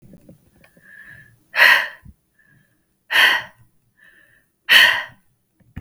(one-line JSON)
{"exhalation_length": "5.8 s", "exhalation_amplitude": 32768, "exhalation_signal_mean_std_ratio": 0.32, "survey_phase": "beta (2021-08-13 to 2022-03-07)", "age": "18-44", "gender": "Female", "wearing_mask": "No", "symptom_runny_or_blocked_nose": true, "symptom_sore_throat": true, "symptom_headache": true, "smoker_status": "Never smoked", "respiratory_condition_asthma": false, "respiratory_condition_other": false, "recruitment_source": "Test and Trace", "submission_delay": "1 day", "covid_test_result": "Positive", "covid_test_method": "RT-qPCR", "covid_ct_value": 27.1, "covid_ct_gene": "ORF1ab gene"}